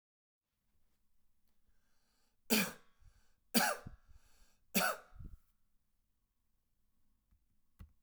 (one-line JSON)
{"three_cough_length": "8.0 s", "three_cough_amplitude": 5478, "three_cough_signal_mean_std_ratio": 0.25, "survey_phase": "beta (2021-08-13 to 2022-03-07)", "age": "18-44", "gender": "Male", "wearing_mask": "No", "symptom_none": true, "smoker_status": "Current smoker (e-cigarettes or vapes only)", "respiratory_condition_asthma": false, "respiratory_condition_other": false, "recruitment_source": "REACT", "submission_delay": "4 days", "covid_test_result": "Negative", "covid_test_method": "RT-qPCR"}